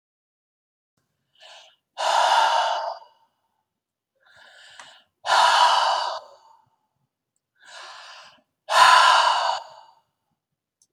{"exhalation_length": "10.9 s", "exhalation_amplitude": 25030, "exhalation_signal_mean_std_ratio": 0.41, "survey_phase": "beta (2021-08-13 to 2022-03-07)", "age": "65+", "gender": "Male", "wearing_mask": "No", "symptom_none": true, "smoker_status": "Never smoked", "respiratory_condition_asthma": false, "respiratory_condition_other": false, "recruitment_source": "REACT", "submission_delay": "2 days", "covid_test_result": "Negative", "covid_test_method": "RT-qPCR", "influenza_a_test_result": "Negative", "influenza_b_test_result": "Negative"}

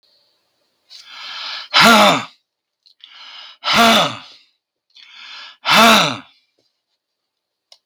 {"exhalation_length": "7.9 s", "exhalation_amplitude": 32768, "exhalation_signal_mean_std_ratio": 0.38, "survey_phase": "beta (2021-08-13 to 2022-03-07)", "age": "65+", "gender": "Male", "wearing_mask": "No", "symptom_none": true, "smoker_status": "Ex-smoker", "respiratory_condition_asthma": false, "respiratory_condition_other": false, "recruitment_source": "REACT", "submission_delay": "3 days", "covid_test_result": "Negative", "covid_test_method": "RT-qPCR", "influenza_a_test_result": "Unknown/Void", "influenza_b_test_result": "Unknown/Void"}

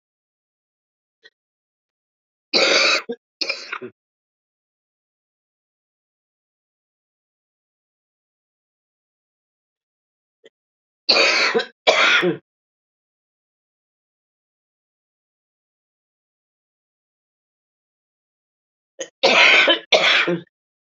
{"three_cough_length": "20.8 s", "three_cough_amplitude": 29146, "three_cough_signal_mean_std_ratio": 0.28, "survey_phase": "beta (2021-08-13 to 2022-03-07)", "age": "45-64", "gender": "Female", "wearing_mask": "No", "symptom_cough_any": true, "symptom_runny_or_blocked_nose": true, "symptom_shortness_of_breath": true, "symptom_sore_throat": true, "symptom_diarrhoea": true, "symptom_fatigue": true, "symptom_headache": true, "symptom_change_to_sense_of_smell_or_taste": true, "symptom_loss_of_taste": true, "symptom_onset": "8 days", "smoker_status": "Ex-smoker", "respiratory_condition_asthma": true, "respiratory_condition_other": false, "recruitment_source": "Test and Trace", "submission_delay": "2 days", "covid_test_result": "Positive", "covid_test_method": "RT-qPCR"}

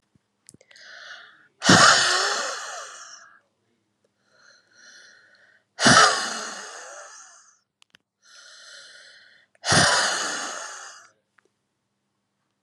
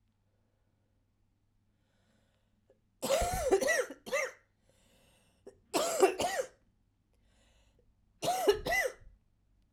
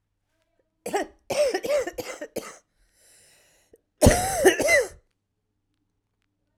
{"exhalation_length": "12.6 s", "exhalation_amplitude": 32267, "exhalation_signal_mean_std_ratio": 0.35, "three_cough_length": "9.7 s", "three_cough_amplitude": 8445, "three_cough_signal_mean_std_ratio": 0.39, "cough_length": "6.6 s", "cough_amplitude": 29058, "cough_signal_mean_std_ratio": 0.37, "survey_phase": "alpha (2021-03-01 to 2021-08-12)", "age": "45-64", "gender": "Female", "wearing_mask": "No", "symptom_cough_any": true, "symptom_fatigue": true, "symptom_fever_high_temperature": true, "symptom_headache": true, "smoker_status": "Current smoker (e-cigarettes or vapes only)", "respiratory_condition_asthma": false, "respiratory_condition_other": false, "recruitment_source": "Test and Trace", "submission_delay": "2 days", "covid_test_result": "Positive", "covid_test_method": "RT-qPCR"}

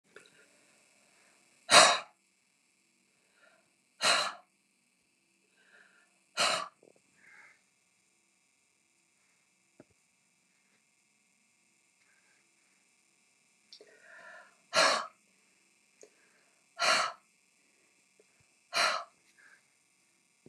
{"exhalation_length": "20.5 s", "exhalation_amplitude": 17766, "exhalation_signal_mean_std_ratio": 0.22, "survey_phase": "beta (2021-08-13 to 2022-03-07)", "age": "65+", "gender": "Female", "wearing_mask": "No", "symptom_none": true, "smoker_status": "Never smoked", "respiratory_condition_asthma": false, "respiratory_condition_other": false, "recruitment_source": "REACT", "submission_delay": "3 days", "covid_test_result": "Negative", "covid_test_method": "RT-qPCR", "influenza_a_test_result": "Negative", "influenza_b_test_result": "Negative"}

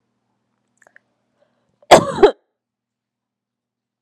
{"cough_length": "4.0 s", "cough_amplitude": 32768, "cough_signal_mean_std_ratio": 0.19, "survey_phase": "beta (2021-08-13 to 2022-03-07)", "age": "18-44", "gender": "Female", "wearing_mask": "No", "symptom_none": true, "smoker_status": "Ex-smoker", "respiratory_condition_asthma": false, "respiratory_condition_other": false, "recruitment_source": "REACT", "submission_delay": "0 days", "covid_test_result": "Negative", "covid_test_method": "RT-qPCR"}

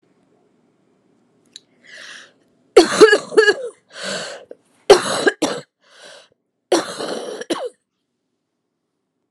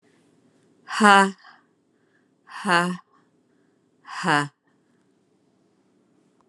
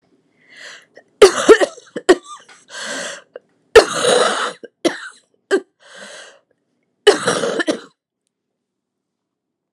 {"three_cough_length": "9.3 s", "three_cough_amplitude": 32768, "three_cough_signal_mean_std_ratio": 0.31, "exhalation_length": "6.5 s", "exhalation_amplitude": 31521, "exhalation_signal_mean_std_ratio": 0.26, "cough_length": "9.7 s", "cough_amplitude": 32768, "cough_signal_mean_std_ratio": 0.32, "survey_phase": "alpha (2021-03-01 to 2021-08-12)", "age": "45-64", "gender": "Female", "wearing_mask": "No", "symptom_cough_any": true, "symptom_fatigue": true, "symptom_fever_high_temperature": true, "symptom_headache": true, "symptom_change_to_sense_of_smell_or_taste": true, "smoker_status": "Never smoked", "respiratory_condition_asthma": false, "respiratory_condition_other": false, "recruitment_source": "Test and Trace", "submission_delay": "2 days", "covid_test_result": "Positive", "covid_test_method": "RT-qPCR", "covid_ct_value": 15.1, "covid_ct_gene": "ORF1ab gene", "covid_ct_mean": 15.6, "covid_viral_load": "7800000 copies/ml", "covid_viral_load_category": "High viral load (>1M copies/ml)"}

